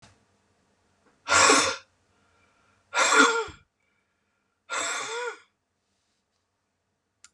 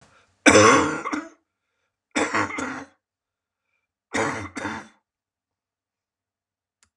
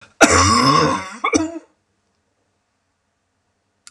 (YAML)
exhalation_length: 7.3 s
exhalation_amplitude: 22053
exhalation_signal_mean_std_ratio: 0.34
three_cough_length: 7.0 s
three_cough_amplitude: 31321
three_cough_signal_mean_std_ratio: 0.32
cough_length: 3.9 s
cough_amplitude: 32768
cough_signal_mean_std_ratio: 0.43
survey_phase: beta (2021-08-13 to 2022-03-07)
age: 65+
gender: Male
wearing_mask: 'No'
symptom_none: true
smoker_status: Never smoked
respiratory_condition_asthma: false
respiratory_condition_other: false
recruitment_source: REACT
submission_delay: 1 day
covid_test_result: Negative
covid_test_method: RT-qPCR